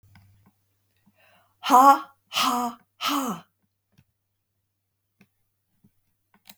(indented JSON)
{
  "exhalation_length": "6.6 s",
  "exhalation_amplitude": 24054,
  "exhalation_signal_mean_std_ratio": 0.27,
  "survey_phase": "beta (2021-08-13 to 2022-03-07)",
  "age": "65+",
  "gender": "Female",
  "wearing_mask": "No",
  "symptom_none": true,
  "smoker_status": "Never smoked",
  "respiratory_condition_asthma": false,
  "respiratory_condition_other": false,
  "recruitment_source": "REACT",
  "submission_delay": "2 days",
  "covid_test_result": "Negative",
  "covid_test_method": "RT-qPCR"
}